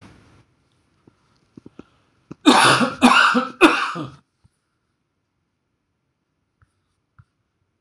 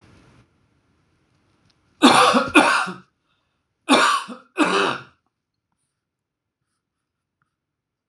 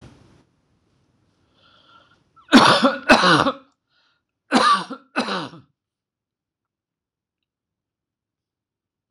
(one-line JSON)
{"three_cough_length": "7.8 s", "three_cough_amplitude": 26028, "three_cough_signal_mean_std_ratio": 0.31, "cough_length": "8.1 s", "cough_amplitude": 26028, "cough_signal_mean_std_ratio": 0.34, "exhalation_length": "9.1 s", "exhalation_amplitude": 26028, "exhalation_signal_mean_std_ratio": 0.3, "survey_phase": "beta (2021-08-13 to 2022-03-07)", "age": "65+", "gender": "Male", "wearing_mask": "No", "symptom_none": true, "smoker_status": "Ex-smoker", "respiratory_condition_asthma": false, "respiratory_condition_other": false, "recruitment_source": "REACT", "submission_delay": "0 days", "covid_test_result": "Negative", "covid_test_method": "RT-qPCR"}